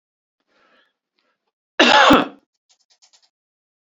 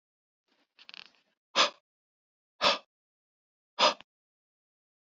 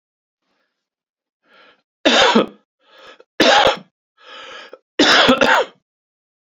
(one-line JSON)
{"cough_length": "3.8 s", "cough_amplitude": 29911, "cough_signal_mean_std_ratio": 0.28, "exhalation_length": "5.1 s", "exhalation_amplitude": 9950, "exhalation_signal_mean_std_ratio": 0.22, "three_cough_length": "6.5 s", "three_cough_amplitude": 30673, "three_cough_signal_mean_std_ratio": 0.39, "survey_phase": "beta (2021-08-13 to 2022-03-07)", "age": "45-64", "gender": "Male", "wearing_mask": "No", "symptom_none": true, "smoker_status": "Ex-smoker", "respiratory_condition_asthma": false, "respiratory_condition_other": false, "recruitment_source": "REACT", "submission_delay": "1 day", "covid_test_result": "Negative", "covid_test_method": "RT-qPCR"}